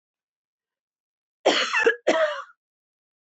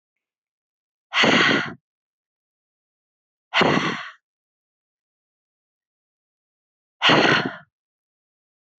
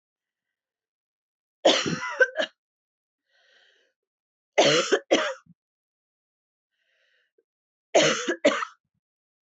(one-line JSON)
{"cough_length": "3.3 s", "cough_amplitude": 15504, "cough_signal_mean_std_ratio": 0.38, "exhalation_length": "8.8 s", "exhalation_amplitude": 23871, "exhalation_signal_mean_std_ratio": 0.32, "three_cough_length": "9.6 s", "three_cough_amplitude": 16275, "three_cough_signal_mean_std_ratio": 0.32, "survey_phase": "beta (2021-08-13 to 2022-03-07)", "age": "18-44", "gender": "Female", "wearing_mask": "No", "symptom_none": true, "smoker_status": "Never smoked", "respiratory_condition_asthma": false, "respiratory_condition_other": false, "recruitment_source": "REACT", "submission_delay": "2 days", "covid_test_result": "Negative", "covid_test_method": "RT-qPCR"}